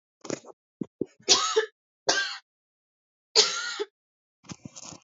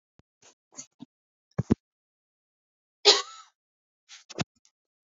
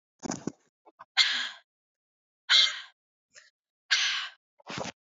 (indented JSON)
{
  "three_cough_length": "5.0 s",
  "three_cough_amplitude": 21800,
  "three_cough_signal_mean_std_ratio": 0.35,
  "cough_length": "5.0 s",
  "cough_amplitude": 22353,
  "cough_signal_mean_std_ratio": 0.17,
  "exhalation_length": "5.0 s",
  "exhalation_amplitude": 14862,
  "exhalation_signal_mean_std_ratio": 0.35,
  "survey_phase": "beta (2021-08-13 to 2022-03-07)",
  "age": "18-44",
  "gender": "Female",
  "wearing_mask": "No",
  "symptom_cough_any": true,
  "symptom_new_continuous_cough": true,
  "symptom_runny_or_blocked_nose": true,
  "symptom_fatigue": true,
  "symptom_onset": "2 days",
  "smoker_status": "Never smoked",
  "respiratory_condition_asthma": false,
  "respiratory_condition_other": false,
  "recruitment_source": "Test and Trace",
  "submission_delay": "2 days",
  "covid_test_result": "Positive",
  "covid_test_method": "RT-qPCR",
  "covid_ct_value": 19.1,
  "covid_ct_gene": "ORF1ab gene",
  "covid_ct_mean": 19.8,
  "covid_viral_load": "320000 copies/ml",
  "covid_viral_load_category": "Low viral load (10K-1M copies/ml)"
}